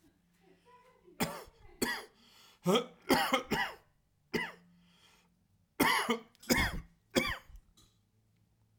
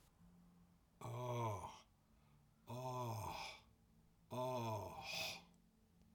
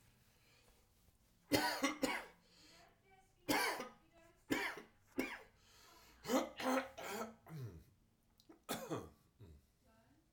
cough_length: 8.8 s
cough_amplitude: 7539
cough_signal_mean_std_ratio: 0.39
exhalation_length: 6.1 s
exhalation_amplitude: 777
exhalation_signal_mean_std_ratio: 0.64
three_cough_length: 10.3 s
three_cough_amplitude: 3567
three_cough_signal_mean_std_ratio: 0.43
survey_phase: alpha (2021-03-01 to 2021-08-12)
age: 45-64
gender: Male
wearing_mask: 'Yes'
symptom_cough_any: true
smoker_status: Never smoked
respiratory_condition_asthma: false
respiratory_condition_other: false
recruitment_source: REACT
submission_delay: 2 days
covid_test_result: Negative
covid_test_method: RT-qPCR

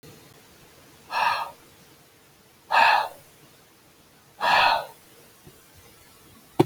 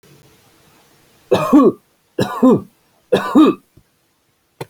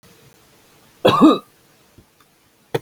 exhalation_length: 6.7 s
exhalation_amplitude: 24516
exhalation_signal_mean_std_ratio: 0.36
three_cough_length: 4.7 s
three_cough_amplitude: 29381
three_cough_signal_mean_std_ratio: 0.39
cough_length: 2.8 s
cough_amplitude: 30613
cough_signal_mean_std_ratio: 0.29
survey_phase: alpha (2021-03-01 to 2021-08-12)
age: 45-64
gender: Male
wearing_mask: 'No'
symptom_none: true
smoker_status: Never smoked
respiratory_condition_asthma: false
respiratory_condition_other: false
recruitment_source: REACT
submission_delay: 1 day
covid_test_result: Negative
covid_test_method: RT-qPCR
covid_ct_value: 44.0
covid_ct_gene: N gene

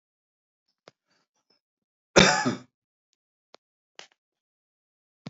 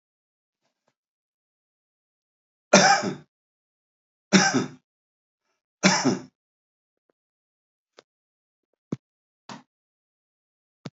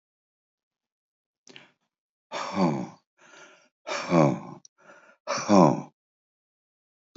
cough_length: 5.3 s
cough_amplitude: 27759
cough_signal_mean_std_ratio: 0.18
three_cough_length: 10.9 s
three_cough_amplitude: 27745
three_cough_signal_mean_std_ratio: 0.23
exhalation_length: 7.2 s
exhalation_amplitude: 20473
exhalation_signal_mean_std_ratio: 0.31
survey_phase: alpha (2021-03-01 to 2021-08-12)
age: 65+
gender: Male
wearing_mask: 'No'
symptom_none: true
smoker_status: Ex-smoker
respiratory_condition_asthma: false
respiratory_condition_other: false
recruitment_source: REACT
submission_delay: 2 days
covid_test_result: Negative
covid_test_method: RT-qPCR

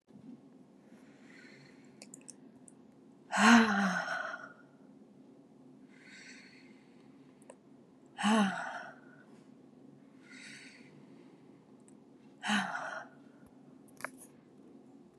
exhalation_length: 15.2 s
exhalation_amplitude: 10078
exhalation_signal_mean_std_ratio: 0.32
survey_phase: beta (2021-08-13 to 2022-03-07)
age: 18-44
gender: Female
wearing_mask: 'No'
symptom_cough_any: true
symptom_runny_or_blocked_nose: true
symptom_sore_throat: true
symptom_change_to_sense_of_smell_or_taste: true
symptom_other: true
symptom_onset: 3 days
smoker_status: Never smoked
respiratory_condition_asthma: false
respiratory_condition_other: false
recruitment_source: Test and Trace
submission_delay: 1 day
covid_test_result: Positive
covid_test_method: ePCR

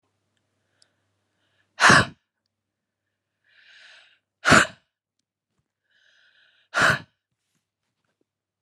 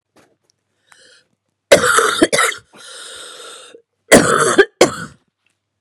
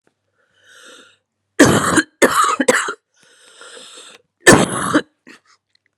exhalation_length: 8.6 s
exhalation_amplitude: 30390
exhalation_signal_mean_std_ratio: 0.21
three_cough_length: 5.8 s
three_cough_amplitude: 32768
three_cough_signal_mean_std_ratio: 0.38
cough_length: 6.0 s
cough_amplitude: 32768
cough_signal_mean_std_ratio: 0.38
survey_phase: beta (2021-08-13 to 2022-03-07)
age: 45-64
gender: Female
wearing_mask: 'No'
symptom_cough_any: true
symptom_runny_or_blocked_nose: true
symptom_sore_throat: true
symptom_fatigue: true
symptom_headache: true
symptom_onset: 3 days
smoker_status: Current smoker (1 to 10 cigarettes per day)
respiratory_condition_asthma: true
respiratory_condition_other: false
recruitment_source: REACT
submission_delay: 2 days
covid_test_result: Negative
covid_test_method: RT-qPCR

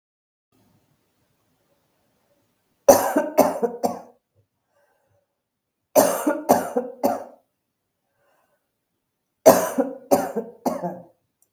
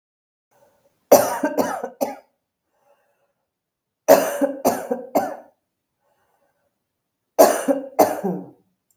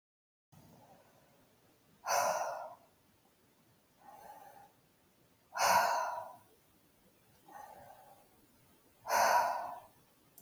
three_cough_length: 11.5 s
three_cough_amplitude: 32768
three_cough_signal_mean_std_ratio: 0.32
cough_length: 9.0 s
cough_amplitude: 32768
cough_signal_mean_std_ratio: 0.35
exhalation_length: 10.4 s
exhalation_amplitude: 5200
exhalation_signal_mean_std_ratio: 0.37
survey_phase: beta (2021-08-13 to 2022-03-07)
age: 45-64
gender: Female
wearing_mask: 'No'
symptom_none: true
smoker_status: Never smoked
respiratory_condition_asthma: false
respiratory_condition_other: false
recruitment_source: REACT
submission_delay: 1 day
covid_test_result: Negative
covid_test_method: RT-qPCR
influenza_a_test_result: Negative
influenza_b_test_result: Negative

